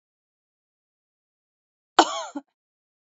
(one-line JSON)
{"cough_length": "3.1 s", "cough_amplitude": 27198, "cough_signal_mean_std_ratio": 0.16, "survey_phase": "beta (2021-08-13 to 2022-03-07)", "age": "45-64", "gender": "Female", "wearing_mask": "No", "symptom_none": true, "smoker_status": "Ex-smoker", "respiratory_condition_asthma": false, "respiratory_condition_other": false, "recruitment_source": "REACT", "submission_delay": "0 days", "covid_test_result": "Negative", "covid_test_method": "RT-qPCR"}